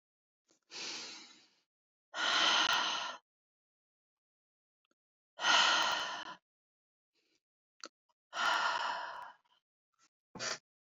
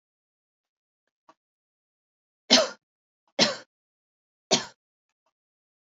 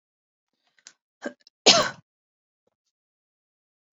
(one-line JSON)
{"exhalation_length": "10.9 s", "exhalation_amplitude": 5262, "exhalation_signal_mean_std_ratio": 0.41, "three_cough_length": "5.8 s", "three_cough_amplitude": 25725, "three_cough_signal_mean_std_ratio": 0.2, "cough_length": "3.9 s", "cough_amplitude": 28077, "cough_signal_mean_std_ratio": 0.18, "survey_phase": "beta (2021-08-13 to 2022-03-07)", "age": "18-44", "gender": "Female", "wearing_mask": "No", "symptom_runny_or_blocked_nose": true, "smoker_status": "Never smoked", "respiratory_condition_asthma": false, "respiratory_condition_other": false, "recruitment_source": "Test and Trace", "submission_delay": "2 days", "covid_test_result": "Negative", "covid_test_method": "RT-qPCR"}